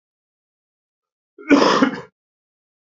{
  "cough_length": "2.9 s",
  "cough_amplitude": 27318,
  "cough_signal_mean_std_ratio": 0.31,
  "survey_phase": "beta (2021-08-13 to 2022-03-07)",
  "age": "45-64",
  "gender": "Male",
  "wearing_mask": "No",
  "symptom_runny_or_blocked_nose": true,
  "symptom_shortness_of_breath": true,
  "symptom_onset": "2 days",
  "smoker_status": "Ex-smoker",
  "respiratory_condition_asthma": true,
  "respiratory_condition_other": true,
  "recruitment_source": "Test and Trace",
  "submission_delay": "2 days",
  "covid_test_result": "Positive",
  "covid_test_method": "RT-qPCR"
}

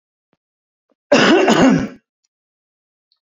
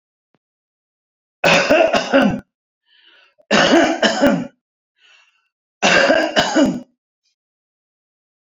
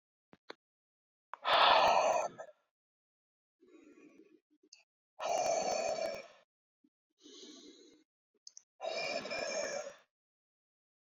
{
  "cough_length": "3.3 s",
  "cough_amplitude": 28119,
  "cough_signal_mean_std_ratio": 0.4,
  "three_cough_length": "8.4 s",
  "three_cough_amplitude": 32768,
  "three_cough_signal_mean_std_ratio": 0.47,
  "exhalation_length": "11.2 s",
  "exhalation_amplitude": 6340,
  "exhalation_signal_mean_std_ratio": 0.39,
  "survey_phase": "beta (2021-08-13 to 2022-03-07)",
  "age": "45-64",
  "gender": "Male",
  "wearing_mask": "No",
  "symptom_change_to_sense_of_smell_or_taste": true,
  "symptom_loss_of_taste": true,
  "smoker_status": "Current smoker (11 or more cigarettes per day)",
  "respiratory_condition_asthma": false,
  "respiratory_condition_other": false,
  "recruitment_source": "REACT",
  "submission_delay": "2 days",
  "covid_test_result": "Negative",
  "covid_test_method": "RT-qPCR"
}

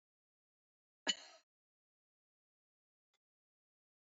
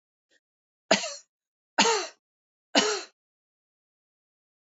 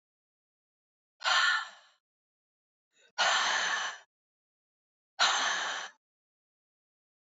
{
  "cough_length": "4.0 s",
  "cough_amplitude": 3320,
  "cough_signal_mean_std_ratio": 0.11,
  "three_cough_length": "4.6 s",
  "three_cough_amplitude": 21271,
  "three_cough_signal_mean_std_ratio": 0.29,
  "exhalation_length": "7.3 s",
  "exhalation_amplitude": 7112,
  "exhalation_signal_mean_std_ratio": 0.41,
  "survey_phase": "beta (2021-08-13 to 2022-03-07)",
  "age": "65+",
  "gender": "Female",
  "wearing_mask": "No",
  "symptom_none": true,
  "smoker_status": "Never smoked",
  "respiratory_condition_asthma": false,
  "respiratory_condition_other": false,
  "recruitment_source": "REACT",
  "submission_delay": "2 days",
  "covid_test_result": "Negative",
  "covid_test_method": "RT-qPCR",
  "influenza_a_test_result": "Negative",
  "influenza_b_test_result": "Negative"
}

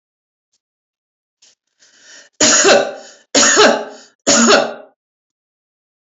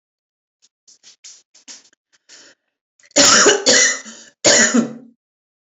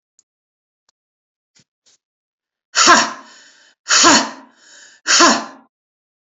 {
  "three_cough_length": "6.1 s",
  "three_cough_amplitude": 32767,
  "three_cough_signal_mean_std_ratio": 0.41,
  "cough_length": "5.6 s",
  "cough_amplitude": 32768,
  "cough_signal_mean_std_ratio": 0.39,
  "exhalation_length": "6.2 s",
  "exhalation_amplitude": 32768,
  "exhalation_signal_mean_std_ratio": 0.34,
  "survey_phase": "beta (2021-08-13 to 2022-03-07)",
  "age": "45-64",
  "gender": "Female",
  "wearing_mask": "No",
  "symptom_none": true,
  "symptom_onset": "12 days",
  "smoker_status": "Ex-smoker",
  "respiratory_condition_asthma": false,
  "respiratory_condition_other": false,
  "recruitment_source": "REACT",
  "submission_delay": "0 days",
  "covid_test_result": "Negative",
  "covid_test_method": "RT-qPCR",
  "influenza_a_test_result": "Unknown/Void",
  "influenza_b_test_result": "Unknown/Void"
}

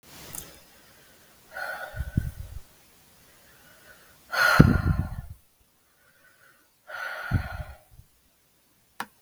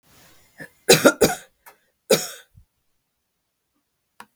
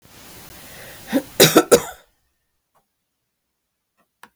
{
  "exhalation_length": "9.2 s",
  "exhalation_amplitude": 32768,
  "exhalation_signal_mean_std_ratio": 0.31,
  "three_cough_length": "4.4 s",
  "three_cough_amplitude": 32768,
  "three_cough_signal_mean_std_ratio": 0.24,
  "cough_length": "4.4 s",
  "cough_amplitude": 32768,
  "cough_signal_mean_std_ratio": 0.25,
  "survey_phase": "beta (2021-08-13 to 2022-03-07)",
  "age": "65+",
  "gender": "Female",
  "wearing_mask": "No",
  "symptom_none": true,
  "smoker_status": "Never smoked",
  "respiratory_condition_asthma": false,
  "respiratory_condition_other": false,
  "recruitment_source": "REACT",
  "submission_delay": "1 day",
  "covid_test_result": "Negative",
  "covid_test_method": "RT-qPCR",
  "influenza_a_test_result": "Negative",
  "influenza_b_test_result": "Negative"
}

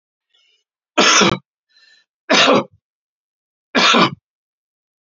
{
  "three_cough_length": "5.1 s",
  "three_cough_amplitude": 32767,
  "three_cough_signal_mean_std_ratio": 0.38,
  "survey_phase": "beta (2021-08-13 to 2022-03-07)",
  "age": "45-64",
  "gender": "Male",
  "wearing_mask": "No",
  "symptom_none": true,
  "smoker_status": "Never smoked",
  "respiratory_condition_asthma": false,
  "respiratory_condition_other": false,
  "recruitment_source": "REACT",
  "submission_delay": "2 days",
  "covid_test_result": "Negative",
  "covid_test_method": "RT-qPCR"
}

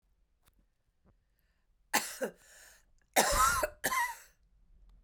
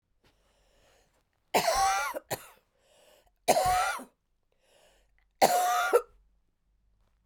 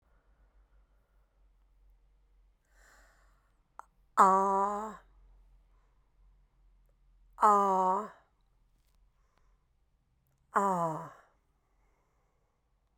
{
  "cough_length": "5.0 s",
  "cough_amplitude": 9278,
  "cough_signal_mean_std_ratio": 0.37,
  "three_cough_length": "7.3 s",
  "three_cough_amplitude": 14353,
  "three_cough_signal_mean_std_ratio": 0.4,
  "exhalation_length": "13.0 s",
  "exhalation_amplitude": 11068,
  "exhalation_signal_mean_std_ratio": 0.29,
  "survey_phase": "beta (2021-08-13 to 2022-03-07)",
  "age": "45-64",
  "gender": "Female",
  "wearing_mask": "No",
  "symptom_cough_any": true,
  "symptom_runny_or_blocked_nose": true,
  "symptom_sore_throat": true,
  "symptom_abdominal_pain": true,
  "symptom_fatigue": true,
  "symptom_headache": true,
  "symptom_change_to_sense_of_smell_or_taste": true,
  "symptom_loss_of_taste": true,
  "symptom_other": true,
  "smoker_status": "Never smoked",
  "respiratory_condition_asthma": true,
  "respiratory_condition_other": false,
  "recruitment_source": "Test and Trace",
  "submission_delay": "0 days",
  "covid_test_result": "Positive",
  "covid_test_method": "LFT"
}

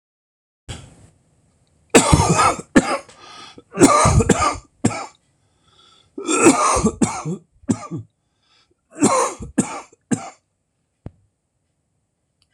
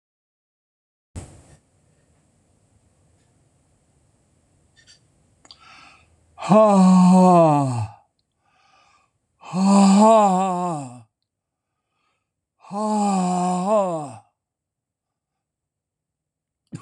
{
  "cough_length": "12.5 s",
  "cough_amplitude": 26028,
  "cough_signal_mean_std_ratio": 0.4,
  "exhalation_length": "16.8 s",
  "exhalation_amplitude": 25171,
  "exhalation_signal_mean_std_ratio": 0.41,
  "survey_phase": "alpha (2021-03-01 to 2021-08-12)",
  "age": "65+",
  "gender": "Male",
  "wearing_mask": "No",
  "symptom_cough_any": true,
  "symptom_fatigue": true,
  "symptom_change_to_sense_of_smell_or_taste": true,
  "symptom_onset": "8 days",
  "smoker_status": "Ex-smoker",
  "respiratory_condition_asthma": false,
  "respiratory_condition_other": false,
  "recruitment_source": "Test and Trace",
  "submission_delay": "2 days",
  "covid_test_result": "Positive",
  "covid_test_method": "RT-qPCR"
}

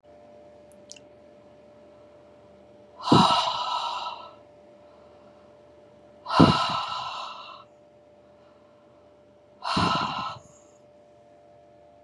{
  "exhalation_length": "12.0 s",
  "exhalation_amplitude": 27428,
  "exhalation_signal_mean_std_ratio": 0.36,
  "survey_phase": "beta (2021-08-13 to 2022-03-07)",
  "age": "45-64",
  "gender": "Female",
  "wearing_mask": "No",
  "symptom_none": true,
  "symptom_onset": "6 days",
  "smoker_status": "Ex-smoker",
  "respiratory_condition_asthma": false,
  "respiratory_condition_other": false,
  "recruitment_source": "REACT",
  "submission_delay": "4 days",
  "covid_test_result": "Negative",
  "covid_test_method": "RT-qPCR",
  "influenza_a_test_result": "Negative",
  "influenza_b_test_result": "Negative"
}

